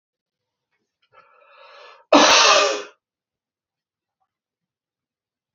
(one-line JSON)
{"cough_length": "5.5 s", "cough_amplitude": 32767, "cough_signal_mean_std_ratio": 0.28, "survey_phase": "beta (2021-08-13 to 2022-03-07)", "age": "45-64", "gender": "Male", "wearing_mask": "No", "symptom_none": true, "smoker_status": "Never smoked", "respiratory_condition_asthma": false, "respiratory_condition_other": false, "recruitment_source": "REACT", "submission_delay": "1 day", "covid_test_result": "Negative", "covid_test_method": "RT-qPCR", "influenza_a_test_result": "Negative", "influenza_b_test_result": "Negative"}